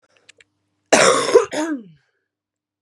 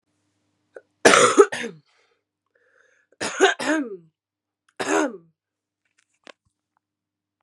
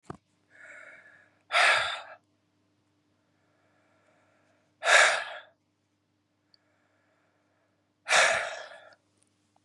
{"cough_length": "2.8 s", "cough_amplitude": 32735, "cough_signal_mean_std_ratio": 0.38, "three_cough_length": "7.4 s", "three_cough_amplitude": 32767, "three_cough_signal_mean_std_ratio": 0.29, "exhalation_length": "9.6 s", "exhalation_amplitude": 18295, "exhalation_signal_mean_std_ratio": 0.29, "survey_phase": "beta (2021-08-13 to 2022-03-07)", "age": "18-44", "gender": "Female", "wearing_mask": "No", "symptom_cough_any": true, "symptom_shortness_of_breath": true, "symptom_sore_throat": true, "symptom_diarrhoea": true, "symptom_fatigue": true, "symptom_fever_high_temperature": true, "symptom_onset": "3 days", "smoker_status": "Never smoked", "respiratory_condition_asthma": true, "respiratory_condition_other": false, "recruitment_source": "Test and Trace", "submission_delay": "2 days", "covid_test_result": "Positive", "covid_test_method": "RT-qPCR", "covid_ct_value": 16.0, "covid_ct_gene": "N gene", "covid_ct_mean": 17.1, "covid_viral_load": "2500000 copies/ml", "covid_viral_load_category": "High viral load (>1M copies/ml)"}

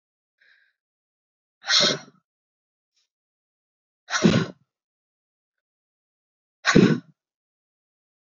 {"exhalation_length": "8.4 s", "exhalation_amplitude": 27071, "exhalation_signal_mean_std_ratio": 0.25, "survey_phase": "beta (2021-08-13 to 2022-03-07)", "age": "18-44", "gender": "Female", "wearing_mask": "No", "symptom_cough_any": true, "symptom_runny_or_blocked_nose": true, "symptom_shortness_of_breath": true, "symptom_headache": true, "symptom_change_to_sense_of_smell_or_taste": true, "symptom_loss_of_taste": true, "symptom_onset": "4 days", "smoker_status": "Ex-smoker", "respiratory_condition_asthma": false, "respiratory_condition_other": false, "recruitment_source": "Test and Trace", "submission_delay": "1 day", "covid_test_result": "Positive", "covid_test_method": "RT-qPCR", "covid_ct_value": 23.2, "covid_ct_gene": "N gene"}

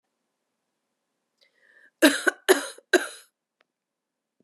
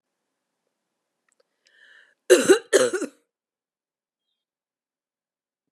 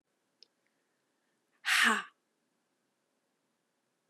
{"three_cough_length": "4.4 s", "three_cough_amplitude": 24025, "three_cough_signal_mean_std_ratio": 0.23, "cough_length": "5.7 s", "cough_amplitude": 28780, "cough_signal_mean_std_ratio": 0.22, "exhalation_length": "4.1 s", "exhalation_amplitude": 6032, "exhalation_signal_mean_std_ratio": 0.24, "survey_phase": "beta (2021-08-13 to 2022-03-07)", "age": "45-64", "gender": "Female", "wearing_mask": "No", "symptom_runny_or_blocked_nose": true, "symptom_change_to_sense_of_smell_or_taste": true, "symptom_onset": "5 days", "smoker_status": "Ex-smoker", "respiratory_condition_asthma": false, "respiratory_condition_other": false, "recruitment_source": "Test and Trace", "submission_delay": "1 day", "covid_test_result": "Positive", "covid_test_method": "RT-qPCR"}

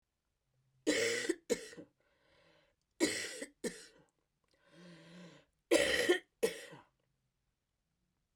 {"three_cough_length": "8.4 s", "three_cough_amplitude": 5403, "three_cough_signal_mean_std_ratio": 0.35, "survey_phase": "beta (2021-08-13 to 2022-03-07)", "age": "65+", "gender": "Female", "wearing_mask": "No", "symptom_cough_any": true, "symptom_runny_or_blocked_nose": true, "symptom_sore_throat": true, "symptom_onset": "4 days", "smoker_status": "Never smoked", "respiratory_condition_asthma": false, "respiratory_condition_other": false, "recruitment_source": "REACT", "submission_delay": "1 day", "covid_test_result": "Negative", "covid_test_method": "RT-qPCR", "influenza_a_test_result": "Unknown/Void", "influenza_b_test_result": "Unknown/Void"}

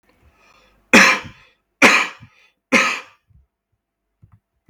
{"three_cough_length": "4.7 s", "three_cough_amplitude": 32768, "three_cough_signal_mean_std_ratio": 0.31, "survey_phase": "beta (2021-08-13 to 2022-03-07)", "age": "18-44", "gender": "Male", "wearing_mask": "No", "symptom_none": true, "smoker_status": "Ex-smoker", "respiratory_condition_asthma": false, "respiratory_condition_other": false, "recruitment_source": "REACT", "submission_delay": "4 days", "covid_test_result": "Negative", "covid_test_method": "RT-qPCR"}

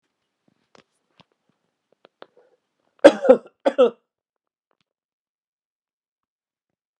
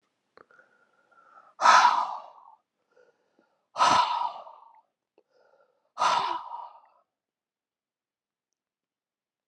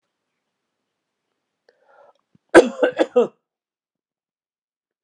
{"cough_length": "7.0 s", "cough_amplitude": 32768, "cough_signal_mean_std_ratio": 0.17, "exhalation_length": "9.5 s", "exhalation_amplitude": 20018, "exhalation_signal_mean_std_ratio": 0.3, "three_cough_length": "5.0 s", "three_cough_amplitude": 32768, "three_cough_signal_mean_std_ratio": 0.2, "survey_phase": "beta (2021-08-13 to 2022-03-07)", "age": "65+", "gender": "Male", "wearing_mask": "No", "symptom_cough_any": true, "symptom_new_continuous_cough": true, "symptom_runny_or_blocked_nose": true, "symptom_fatigue": true, "symptom_fever_high_temperature": true, "symptom_headache": true, "symptom_onset": "4 days", "smoker_status": "Ex-smoker", "respiratory_condition_asthma": false, "respiratory_condition_other": false, "recruitment_source": "Test and Trace", "submission_delay": "1 day", "covid_test_result": "Positive", "covid_test_method": "RT-qPCR", "covid_ct_value": 20.6, "covid_ct_gene": "ORF1ab gene"}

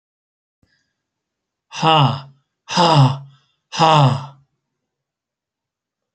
{"exhalation_length": "6.1 s", "exhalation_amplitude": 32767, "exhalation_signal_mean_std_ratio": 0.37, "survey_phase": "alpha (2021-03-01 to 2021-08-12)", "age": "45-64", "gender": "Male", "wearing_mask": "No", "symptom_none": true, "smoker_status": "Never smoked", "respiratory_condition_asthma": true, "respiratory_condition_other": false, "recruitment_source": "REACT", "submission_delay": "2 days", "covid_test_result": "Negative", "covid_test_method": "RT-qPCR"}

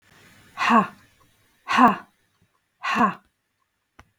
{"exhalation_length": "4.2 s", "exhalation_amplitude": 22408, "exhalation_signal_mean_std_ratio": 0.35, "survey_phase": "beta (2021-08-13 to 2022-03-07)", "age": "45-64", "gender": "Female", "wearing_mask": "No", "symptom_none": true, "smoker_status": "Never smoked", "respiratory_condition_asthma": false, "respiratory_condition_other": false, "recruitment_source": "REACT", "submission_delay": "1 day", "covid_test_result": "Negative", "covid_test_method": "RT-qPCR"}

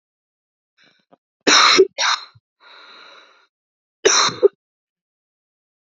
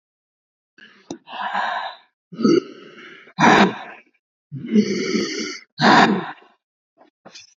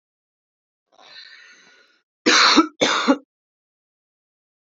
{"three_cough_length": "5.9 s", "three_cough_amplitude": 29907, "three_cough_signal_mean_std_ratio": 0.31, "exhalation_length": "7.6 s", "exhalation_amplitude": 27930, "exhalation_signal_mean_std_ratio": 0.43, "cough_length": "4.7 s", "cough_amplitude": 27679, "cough_signal_mean_std_ratio": 0.32, "survey_phase": "beta (2021-08-13 to 2022-03-07)", "age": "18-44", "gender": "Female", "wearing_mask": "No", "symptom_cough_any": true, "symptom_shortness_of_breath": true, "symptom_sore_throat": true, "symptom_fatigue": true, "symptom_headache": true, "symptom_other": true, "symptom_onset": "2 days", "smoker_status": "Never smoked", "respiratory_condition_asthma": false, "respiratory_condition_other": false, "recruitment_source": "Test and Trace", "submission_delay": "1 day", "covid_test_result": "Positive", "covid_test_method": "RT-qPCR", "covid_ct_value": 29.0, "covid_ct_gene": "ORF1ab gene", "covid_ct_mean": 29.5, "covid_viral_load": "210 copies/ml", "covid_viral_load_category": "Minimal viral load (< 10K copies/ml)"}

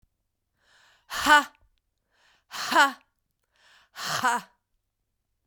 {"exhalation_length": "5.5 s", "exhalation_amplitude": 19436, "exhalation_signal_mean_std_ratio": 0.29, "survey_phase": "beta (2021-08-13 to 2022-03-07)", "age": "18-44", "gender": "Female", "wearing_mask": "No", "symptom_cough_any": true, "symptom_new_continuous_cough": true, "symptom_runny_or_blocked_nose": true, "symptom_fatigue": true, "symptom_headache": true, "symptom_onset": "6 days", "smoker_status": "Never smoked", "respiratory_condition_asthma": true, "respiratory_condition_other": false, "recruitment_source": "REACT", "submission_delay": "1 day", "covid_test_result": "Negative", "covid_test_method": "RT-qPCR", "influenza_a_test_result": "Negative", "influenza_b_test_result": "Negative"}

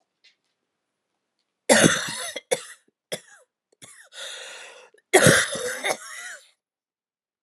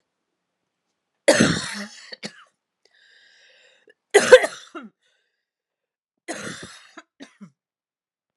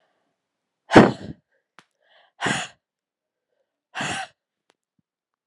{"cough_length": "7.4 s", "cough_amplitude": 31464, "cough_signal_mean_std_ratio": 0.32, "three_cough_length": "8.4 s", "three_cough_amplitude": 32768, "three_cough_signal_mean_std_ratio": 0.21, "exhalation_length": "5.5 s", "exhalation_amplitude": 32768, "exhalation_signal_mean_std_ratio": 0.2, "survey_phase": "beta (2021-08-13 to 2022-03-07)", "age": "18-44", "gender": "Female", "wearing_mask": "No", "symptom_cough_any": true, "symptom_new_continuous_cough": true, "symptom_runny_or_blocked_nose": true, "symptom_sore_throat": true, "symptom_fatigue": true, "symptom_fever_high_temperature": true, "symptom_headache": true, "symptom_change_to_sense_of_smell_or_taste": true, "symptom_loss_of_taste": true, "symptom_onset": "5 days", "smoker_status": "Never smoked", "respiratory_condition_asthma": false, "respiratory_condition_other": false, "recruitment_source": "Test and Trace", "submission_delay": "2 days", "covid_test_result": "Positive", "covid_test_method": "RT-qPCR", "covid_ct_value": 13.1, "covid_ct_gene": "S gene", "covid_ct_mean": 13.3, "covid_viral_load": "43000000 copies/ml", "covid_viral_load_category": "High viral load (>1M copies/ml)"}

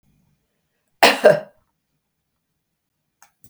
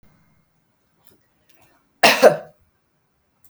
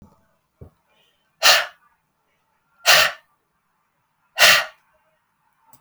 {"cough_length": "3.5 s", "cough_amplitude": 32768, "cough_signal_mean_std_ratio": 0.22, "three_cough_length": "3.5 s", "three_cough_amplitude": 32768, "three_cough_signal_mean_std_ratio": 0.22, "exhalation_length": "5.8 s", "exhalation_amplitude": 32768, "exhalation_signal_mean_std_ratio": 0.28, "survey_phase": "beta (2021-08-13 to 2022-03-07)", "age": "45-64", "gender": "Female", "wearing_mask": "No", "symptom_runny_or_blocked_nose": true, "smoker_status": "Ex-smoker", "respiratory_condition_asthma": false, "respiratory_condition_other": false, "recruitment_source": "REACT", "submission_delay": "2 days", "covid_test_result": "Negative", "covid_test_method": "RT-qPCR", "influenza_a_test_result": "Negative", "influenza_b_test_result": "Negative"}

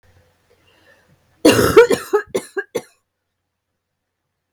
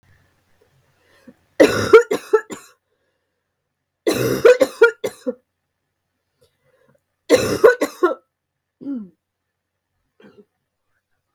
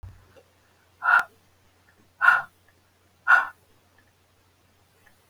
{"cough_length": "4.5 s", "cough_amplitude": 32768, "cough_signal_mean_std_ratio": 0.3, "three_cough_length": "11.3 s", "three_cough_amplitude": 32768, "three_cough_signal_mean_std_ratio": 0.29, "exhalation_length": "5.3 s", "exhalation_amplitude": 22440, "exhalation_signal_mean_std_ratio": 0.27, "survey_phase": "alpha (2021-03-01 to 2021-08-12)", "age": "45-64", "gender": "Female", "wearing_mask": "No", "symptom_abdominal_pain": true, "symptom_fatigue": true, "symptom_fever_high_temperature": true, "symptom_headache": true, "symptom_change_to_sense_of_smell_or_taste": true, "symptom_onset": "4 days", "smoker_status": "Ex-smoker", "respiratory_condition_asthma": false, "respiratory_condition_other": false, "recruitment_source": "Test and Trace", "submission_delay": "2 days", "covid_test_result": "Positive", "covid_test_method": "RT-qPCR", "covid_ct_value": 16.7, "covid_ct_gene": "ORF1ab gene", "covid_ct_mean": 17.7, "covid_viral_load": "1500000 copies/ml", "covid_viral_load_category": "High viral load (>1M copies/ml)"}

